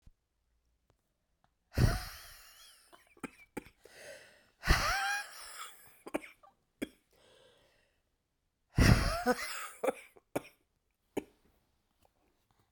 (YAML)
exhalation_length: 12.7 s
exhalation_amplitude: 9431
exhalation_signal_mean_std_ratio: 0.3
survey_phase: beta (2021-08-13 to 2022-03-07)
age: 18-44
gender: Female
wearing_mask: 'No'
symptom_cough_any: true
symptom_new_continuous_cough: true
symptom_runny_or_blocked_nose: true
symptom_fatigue: true
symptom_fever_high_temperature: true
symptom_headache: true
symptom_change_to_sense_of_smell_or_taste: true
symptom_loss_of_taste: true
symptom_onset: 2 days
smoker_status: Never smoked
respiratory_condition_asthma: false
respiratory_condition_other: false
recruitment_source: Test and Trace
submission_delay: 2 days
covid_test_result: Positive
covid_test_method: RT-qPCR
covid_ct_value: 16.6
covid_ct_gene: ORF1ab gene
covid_ct_mean: 17.2
covid_viral_load: 2400000 copies/ml
covid_viral_load_category: High viral load (>1M copies/ml)